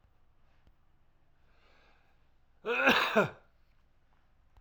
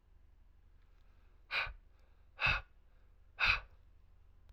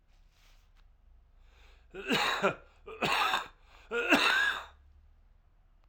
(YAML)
cough_length: 4.6 s
cough_amplitude: 9832
cough_signal_mean_std_ratio: 0.3
exhalation_length: 4.5 s
exhalation_amplitude: 4519
exhalation_signal_mean_std_ratio: 0.35
three_cough_length: 5.9 s
three_cough_amplitude: 9119
three_cough_signal_mean_std_ratio: 0.46
survey_phase: beta (2021-08-13 to 2022-03-07)
age: 18-44
gender: Male
wearing_mask: 'Yes'
symptom_cough_any: true
symptom_shortness_of_breath: true
symptom_abdominal_pain: true
symptom_fatigue: true
symptom_headache: true
symptom_change_to_sense_of_smell_or_taste: true
symptom_loss_of_taste: true
symptom_other: true
symptom_onset: 6 days
smoker_status: Current smoker (1 to 10 cigarettes per day)
respiratory_condition_asthma: false
respiratory_condition_other: false
recruitment_source: Test and Trace
submission_delay: 3 days
covid_test_result: Positive
covid_test_method: RT-qPCR